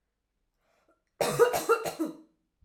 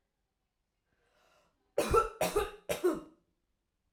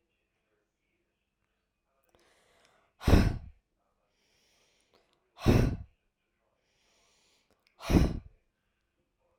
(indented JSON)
{
  "cough_length": "2.6 s",
  "cough_amplitude": 11729,
  "cough_signal_mean_std_ratio": 0.4,
  "three_cough_length": "3.9 s",
  "three_cough_amplitude": 6395,
  "three_cough_signal_mean_std_ratio": 0.36,
  "exhalation_length": "9.4 s",
  "exhalation_amplitude": 12343,
  "exhalation_signal_mean_std_ratio": 0.24,
  "survey_phase": "alpha (2021-03-01 to 2021-08-12)",
  "age": "18-44",
  "gender": "Female",
  "wearing_mask": "No",
  "symptom_none": true,
  "smoker_status": "Never smoked",
  "respiratory_condition_asthma": false,
  "respiratory_condition_other": false,
  "recruitment_source": "REACT",
  "submission_delay": "1 day",
  "covid_test_result": "Negative",
  "covid_test_method": "RT-qPCR"
}